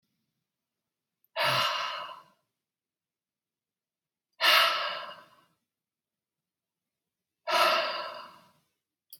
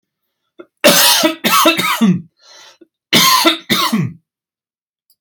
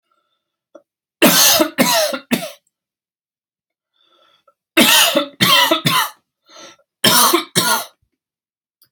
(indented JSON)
{
  "exhalation_length": "9.2 s",
  "exhalation_amplitude": 11911,
  "exhalation_signal_mean_std_ratio": 0.35,
  "cough_length": "5.2 s",
  "cough_amplitude": 32768,
  "cough_signal_mean_std_ratio": 0.54,
  "three_cough_length": "8.9 s",
  "three_cough_amplitude": 32768,
  "three_cough_signal_mean_std_ratio": 0.45,
  "survey_phase": "alpha (2021-03-01 to 2021-08-12)",
  "age": "18-44",
  "gender": "Male",
  "wearing_mask": "No",
  "symptom_fatigue": true,
  "symptom_onset": "12 days",
  "smoker_status": "Ex-smoker",
  "respiratory_condition_asthma": false,
  "respiratory_condition_other": false,
  "recruitment_source": "REACT",
  "submission_delay": "6 days",
  "covid_test_result": "Negative",
  "covid_test_method": "RT-qPCR"
}